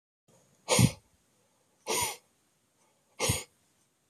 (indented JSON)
{
  "exhalation_length": "4.1 s",
  "exhalation_amplitude": 11607,
  "exhalation_signal_mean_std_ratio": 0.3,
  "survey_phase": "beta (2021-08-13 to 2022-03-07)",
  "age": "45-64",
  "gender": "Male",
  "wearing_mask": "No",
  "symptom_none": true,
  "smoker_status": "Never smoked",
  "respiratory_condition_asthma": false,
  "respiratory_condition_other": false,
  "recruitment_source": "REACT",
  "submission_delay": "1 day",
  "covid_test_result": "Negative",
  "covid_test_method": "RT-qPCR"
}